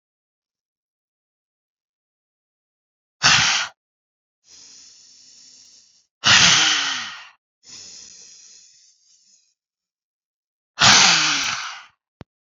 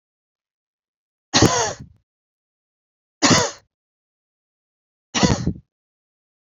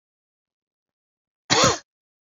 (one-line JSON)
{"exhalation_length": "12.5 s", "exhalation_amplitude": 32636, "exhalation_signal_mean_std_ratio": 0.32, "three_cough_length": "6.6 s", "three_cough_amplitude": 29927, "three_cough_signal_mean_std_ratio": 0.29, "cough_length": "2.4 s", "cough_amplitude": 22657, "cough_signal_mean_std_ratio": 0.26, "survey_phase": "beta (2021-08-13 to 2022-03-07)", "age": "18-44", "gender": "Female", "wearing_mask": "No", "symptom_runny_or_blocked_nose": true, "symptom_sore_throat": true, "symptom_fatigue": true, "symptom_onset": "8 days", "smoker_status": "Ex-smoker", "respiratory_condition_asthma": false, "respiratory_condition_other": false, "recruitment_source": "Test and Trace", "submission_delay": "2 days", "covid_test_result": "Positive", "covid_test_method": "RT-qPCR", "covid_ct_value": 26.2, "covid_ct_gene": "ORF1ab gene"}